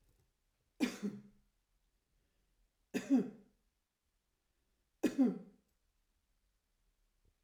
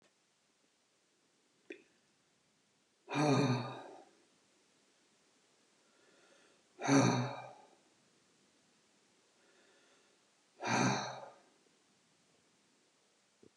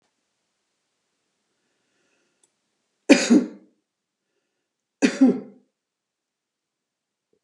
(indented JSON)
{
  "three_cough_length": "7.4 s",
  "three_cough_amplitude": 2920,
  "three_cough_signal_mean_std_ratio": 0.26,
  "exhalation_length": "13.6 s",
  "exhalation_amplitude": 4957,
  "exhalation_signal_mean_std_ratio": 0.3,
  "cough_length": "7.4 s",
  "cough_amplitude": 29203,
  "cough_signal_mean_std_ratio": 0.21,
  "survey_phase": "alpha (2021-03-01 to 2021-08-12)",
  "age": "65+",
  "gender": "Female",
  "wearing_mask": "No",
  "symptom_none": true,
  "symptom_onset": "2 days",
  "smoker_status": "Ex-smoker",
  "respiratory_condition_asthma": false,
  "respiratory_condition_other": false,
  "recruitment_source": "REACT",
  "submission_delay": "1 day",
  "covid_test_result": "Negative",
  "covid_test_method": "RT-qPCR"
}